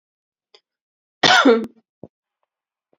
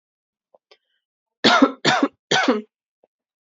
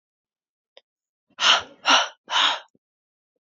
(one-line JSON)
{"cough_length": "3.0 s", "cough_amplitude": 28336, "cough_signal_mean_std_ratio": 0.29, "three_cough_length": "3.5 s", "three_cough_amplitude": 27923, "three_cough_signal_mean_std_ratio": 0.36, "exhalation_length": "3.4 s", "exhalation_amplitude": 21903, "exhalation_signal_mean_std_ratio": 0.35, "survey_phase": "beta (2021-08-13 to 2022-03-07)", "age": "18-44", "gender": "Female", "wearing_mask": "No", "symptom_runny_or_blocked_nose": true, "symptom_sore_throat": true, "symptom_fatigue": true, "symptom_headache": true, "symptom_other": true, "smoker_status": "Never smoked", "respiratory_condition_asthma": false, "respiratory_condition_other": false, "recruitment_source": "Test and Trace", "submission_delay": "2 days", "covid_test_result": "Positive", "covid_test_method": "RT-qPCR", "covid_ct_value": 25.8, "covid_ct_gene": "N gene"}